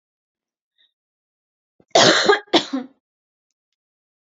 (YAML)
cough_length: 4.3 s
cough_amplitude: 31745
cough_signal_mean_std_ratio: 0.29
survey_phase: beta (2021-08-13 to 2022-03-07)
age: 18-44
gender: Female
wearing_mask: 'No'
symptom_cough_any: true
symptom_runny_or_blocked_nose: true
symptom_shortness_of_breath: true
symptom_sore_throat: true
symptom_fatigue: true
symptom_onset: 3 days
smoker_status: Ex-smoker
respiratory_condition_asthma: false
respiratory_condition_other: false
recruitment_source: Test and Trace
submission_delay: 1 day
covid_test_result: Positive
covid_test_method: RT-qPCR
covid_ct_value: 19.1
covid_ct_gene: ORF1ab gene